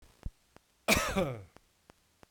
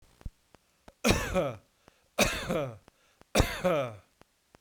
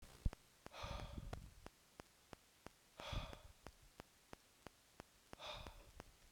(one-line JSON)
{"cough_length": "2.3 s", "cough_amplitude": 7616, "cough_signal_mean_std_ratio": 0.38, "three_cough_length": "4.6 s", "three_cough_amplitude": 15417, "three_cough_signal_mean_std_ratio": 0.45, "exhalation_length": "6.3 s", "exhalation_amplitude": 1989, "exhalation_signal_mean_std_ratio": 0.42, "survey_phase": "beta (2021-08-13 to 2022-03-07)", "age": "45-64", "gender": "Male", "wearing_mask": "No", "symptom_none": true, "smoker_status": "Ex-smoker", "respiratory_condition_asthma": false, "respiratory_condition_other": false, "recruitment_source": "REACT", "submission_delay": "2 days", "covid_test_result": "Negative", "covid_test_method": "RT-qPCR", "influenza_a_test_result": "Negative", "influenza_b_test_result": "Negative"}